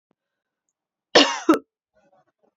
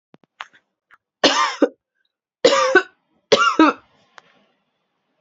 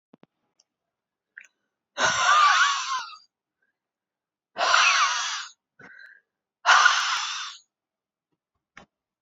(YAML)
cough_length: 2.6 s
cough_amplitude: 28825
cough_signal_mean_std_ratio: 0.25
three_cough_length: 5.2 s
three_cough_amplitude: 30345
three_cough_signal_mean_std_ratio: 0.35
exhalation_length: 9.2 s
exhalation_amplitude: 21209
exhalation_signal_mean_std_ratio: 0.42
survey_phase: beta (2021-08-13 to 2022-03-07)
age: 18-44
gender: Female
wearing_mask: 'No'
symptom_cough_any: true
symptom_runny_or_blocked_nose: true
symptom_shortness_of_breath: true
symptom_sore_throat: true
symptom_fatigue: true
symptom_headache: true
symptom_change_to_sense_of_smell_or_taste: true
symptom_loss_of_taste: true
smoker_status: Ex-smoker
respiratory_condition_asthma: false
respiratory_condition_other: false
recruitment_source: Test and Trace
submission_delay: 1 day
covid_test_result: Positive
covid_test_method: ePCR